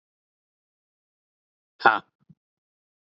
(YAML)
exhalation_length: 3.2 s
exhalation_amplitude: 27208
exhalation_signal_mean_std_ratio: 0.13
survey_phase: beta (2021-08-13 to 2022-03-07)
age: 18-44
gender: Male
wearing_mask: 'No'
symptom_none: true
smoker_status: Never smoked
respiratory_condition_asthma: false
respiratory_condition_other: false
recruitment_source: REACT
submission_delay: 1 day
covid_test_result: Negative
covid_test_method: RT-qPCR
influenza_a_test_result: Negative
influenza_b_test_result: Negative